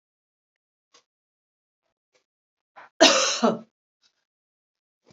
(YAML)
cough_length: 5.1 s
cough_amplitude: 28508
cough_signal_mean_std_ratio: 0.23
survey_phase: beta (2021-08-13 to 2022-03-07)
age: 45-64
gender: Female
wearing_mask: 'No'
symptom_none: true
smoker_status: Ex-smoker
respiratory_condition_asthma: false
respiratory_condition_other: false
recruitment_source: REACT
submission_delay: 1 day
covid_test_result: Negative
covid_test_method: RT-qPCR
influenza_a_test_result: Negative
influenza_b_test_result: Negative